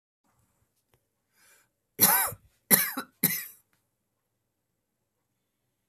{"three_cough_length": "5.9 s", "three_cough_amplitude": 26128, "three_cough_signal_mean_std_ratio": 0.25, "survey_phase": "beta (2021-08-13 to 2022-03-07)", "age": "45-64", "gender": "Female", "wearing_mask": "No", "symptom_cough_any": true, "symptom_new_continuous_cough": true, "symptom_sore_throat": true, "smoker_status": "Ex-smoker", "respiratory_condition_asthma": false, "respiratory_condition_other": false, "recruitment_source": "Test and Trace", "submission_delay": "1 day", "covid_test_result": "Negative", "covid_test_method": "RT-qPCR"}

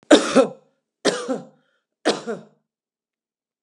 {"three_cough_length": "3.6 s", "three_cough_amplitude": 32768, "three_cough_signal_mean_std_ratio": 0.32, "survey_phase": "alpha (2021-03-01 to 2021-08-12)", "age": "65+", "gender": "Female", "wearing_mask": "No", "symptom_none": true, "smoker_status": "Never smoked", "respiratory_condition_asthma": false, "respiratory_condition_other": false, "recruitment_source": "REACT", "submission_delay": "2 days", "covid_test_result": "Negative", "covid_test_method": "RT-qPCR"}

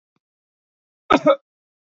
{"cough_length": "2.0 s", "cough_amplitude": 26962, "cough_signal_mean_std_ratio": 0.24, "survey_phase": "alpha (2021-03-01 to 2021-08-12)", "age": "18-44", "gender": "Male", "wearing_mask": "No", "symptom_none": true, "symptom_onset": "8 days", "smoker_status": "Never smoked", "respiratory_condition_asthma": false, "respiratory_condition_other": false, "recruitment_source": "REACT", "submission_delay": "1 day", "covid_test_result": "Negative", "covid_test_method": "RT-qPCR"}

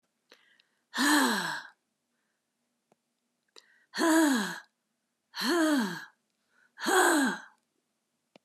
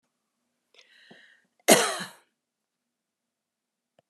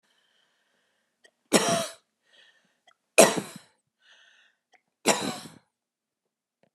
{"exhalation_length": "8.4 s", "exhalation_amplitude": 8548, "exhalation_signal_mean_std_ratio": 0.45, "cough_length": "4.1 s", "cough_amplitude": 26146, "cough_signal_mean_std_ratio": 0.19, "three_cough_length": "6.7 s", "three_cough_amplitude": 28937, "three_cough_signal_mean_std_ratio": 0.23, "survey_phase": "beta (2021-08-13 to 2022-03-07)", "age": "65+", "gender": "Female", "wearing_mask": "No", "symptom_none": true, "smoker_status": "Ex-smoker", "respiratory_condition_asthma": false, "respiratory_condition_other": false, "recruitment_source": "REACT", "submission_delay": "5 days", "covid_test_result": "Negative", "covid_test_method": "RT-qPCR", "influenza_a_test_result": "Negative", "influenza_b_test_result": "Negative"}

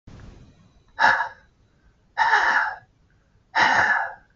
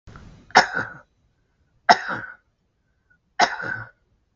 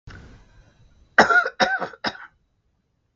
{"exhalation_length": "4.4 s", "exhalation_amplitude": 23598, "exhalation_signal_mean_std_ratio": 0.49, "three_cough_length": "4.4 s", "three_cough_amplitude": 32768, "three_cough_signal_mean_std_ratio": 0.28, "cough_length": "3.2 s", "cough_amplitude": 32766, "cough_signal_mean_std_ratio": 0.33, "survey_phase": "beta (2021-08-13 to 2022-03-07)", "age": "65+", "gender": "Male", "wearing_mask": "No", "symptom_shortness_of_breath": true, "smoker_status": "Ex-smoker", "respiratory_condition_asthma": false, "respiratory_condition_other": true, "recruitment_source": "REACT", "submission_delay": "2 days", "covid_test_result": "Negative", "covid_test_method": "RT-qPCR", "influenza_a_test_result": "Negative", "influenza_b_test_result": "Negative"}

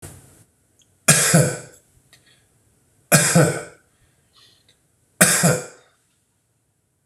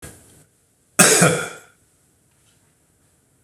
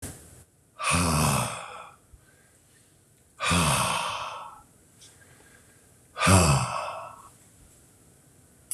{"three_cough_length": "7.1 s", "three_cough_amplitude": 26028, "three_cough_signal_mean_std_ratio": 0.35, "cough_length": "3.4 s", "cough_amplitude": 26028, "cough_signal_mean_std_ratio": 0.3, "exhalation_length": "8.7 s", "exhalation_amplitude": 15861, "exhalation_signal_mean_std_ratio": 0.46, "survey_phase": "beta (2021-08-13 to 2022-03-07)", "age": "45-64", "gender": "Male", "wearing_mask": "No", "symptom_cough_any": true, "symptom_runny_or_blocked_nose": true, "smoker_status": "Never smoked", "respiratory_condition_asthma": false, "respiratory_condition_other": false, "recruitment_source": "Test and Trace", "submission_delay": "2 days", "covid_test_result": "Positive", "covid_test_method": "RT-qPCR", "covid_ct_value": 27.0, "covid_ct_gene": "ORF1ab gene", "covid_ct_mean": 27.8, "covid_viral_load": "740 copies/ml", "covid_viral_load_category": "Minimal viral load (< 10K copies/ml)"}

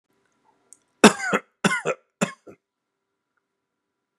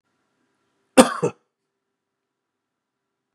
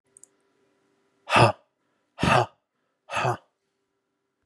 {"three_cough_length": "4.2 s", "three_cough_amplitude": 32768, "three_cough_signal_mean_std_ratio": 0.23, "cough_length": "3.3 s", "cough_amplitude": 32768, "cough_signal_mean_std_ratio": 0.16, "exhalation_length": "4.5 s", "exhalation_amplitude": 21137, "exhalation_signal_mean_std_ratio": 0.3, "survey_phase": "beta (2021-08-13 to 2022-03-07)", "age": "45-64", "gender": "Male", "wearing_mask": "No", "symptom_none": true, "smoker_status": "Never smoked", "respiratory_condition_asthma": false, "respiratory_condition_other": false, "recruitment_source": "REACT", "submission_delay": "2 days", "covid_test_result": "Negative", "covid_test_method": "RT-qPCR", "influenza_a_test_result": "Negative", "influenza_b_test_result": "Negative"}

